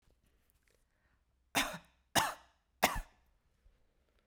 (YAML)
three_cough_length: 4.3 s
three_cough_amplitude: 7985
three_cough_signal_mean_std_ratio: 0.26
survey_phase: beta (2021-08-13 to 2022-03-07)
age: 45-64
gender: Female
wearing_mask: 'No'
symptom_runny_or_blocked_nose: true
symptom_sore_throat: true
symptom_diarrhoea: true
symptom_fatigue: true
symptom_other: true
smoker_status: Never smoked
respiratory_condition_asthma: false
respiratory_condition_other: false
recruitment_source: Test and Trace
submission_delay: 2 days
covid_test_result: Positive
covid_test_method: RT-qPCR
covid_ct_value: 26.8
covid_ct_gene: ORF1ab gene
covid_ct_mean: 27.8
covid_viral_load: 750 copies/ml
covid_viral_load_category: Minimal viral load (< 10K copies/ml)